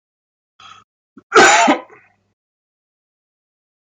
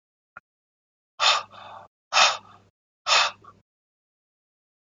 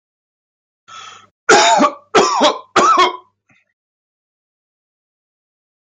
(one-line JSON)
{"cough_length": "3.9 s", "cough_amplitude": 32768, "cough_signal_mean_std_ratio": 0.28, "exhalation_length": "4.9 s", "exhalation_amplitude": 21163, "exhalation_signal_mean_std_ratio": 0.3, "three_cough_length": "6.0 s", "three_cough_amplitude": 32768, "three_cough_signal_mean_std_ratio": 0.39, "survey_phase": "beta (2021-08-13 to 2022-03-07)", "age": "18-44", "gender": "Male", "wearing_mask": "No", "symptom_none": true, "smoker_status": "Ex-smoker", "respiratory_condition_asthma": false, "respiratory_condition_other": false, "recruitment_source": "REACT", "submission_delay": "1 day", "covid_test_result": "Negative", "covid_test_method": "RT-qPCR", "influenza_a_test_result": "Negative", "influenza_b_test_result": "Negative"}